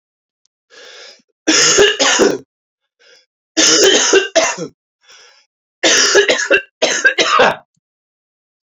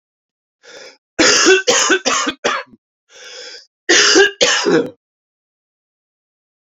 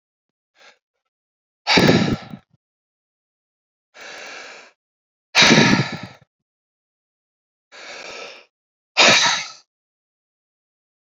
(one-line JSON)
{"three_cough_length": "8.8 s", "three_cough_amplitude": 32768, "three_cough_signal_mean_std_ratio": 0.52, "cough_length": "6.7 s", "cough_amplitude": 32768, "cough_signal_mean_std_ratio": 0.47, "exhalation_length": "11.0 s", "exhalation_amplitude": 32767, "exhalation_signal_mean_std_ratio": 0.31, "survey_phase": "beta (2021-08-13 to 2022-03-07)", "age": "18-44", "gender": "Male", "wearing_mask": "No", "symptom_cough_any": true, "symptom_runny_or_blocked_nose": true, "symptom_sore_throat": true, "symptom_fatigue": true, "symptom_change_to_sense_of_smell_or_taste": true, "symptom_loss_of_taste": true, "smoker_status": "Never smoked", "respiratory_condition_asthma": true, "respiratory_condition_other": false, "recruitment_source": "Test and Trace", "submission_delay": "1 day", "covid_test_result": "Positive", "covid_test_method": "RT-qPCR", "covid_ct_value": 31.3, "covid_ct_gene": "ORF1ab gene"}